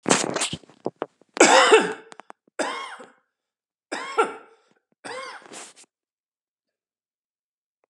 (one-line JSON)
{"three_cough_length": "7.9 s", "three_cough_amplitude": 31187, "three_cough_signal_mean_std_ratio": 0.31, "survey_phase": "beta (2021-08-13 to 2022-03-07)", "age": "65+", "gender": "Male", "wearing_mask": "No", "symptom_cough_any": true, "symptom_runny_or_blocked_nose": true, "smoker_status": "Ex-smoker", "respiratory_condition_asthma": false, "respiratory_condition_other": false, "recruitment_source": "REACT", "submission_delay": "2 days", "covid_test_result": "Negative", "covid_test_method": "RT-qPCR", "influenza_a_test_result": "Negative", "influenza_b_test_result": "Negative"}